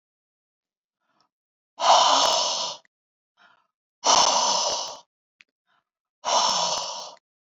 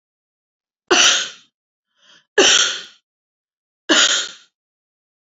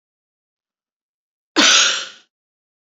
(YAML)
exhalation_length: 7.6 s
exhalation_amplitude: 20459
exhalation_signal_mean_std_ratio: 0.45
three_cough_length: 5.2 s
three_cough_amplitude: 32767
three_cough_signal_mean_std_ratio: 0.37
cough_length: 2.9 s
cough_amplitude: 29856
cough_signal_mean_std_ratio: 0.32
survey_phase: beta (2021-08-13 to 2022-03-07)
age: 45-64
gender: Female
wearing_mask: 'No'
symptom_none: true
smoker_status: Never smoked
respiratory_condition_asthma: false
respiratory_condition_other: false
recruitment_source: REACT
submission_delay: 12 days
covid_test_result: Negative
covid_test_method: RT-qPCR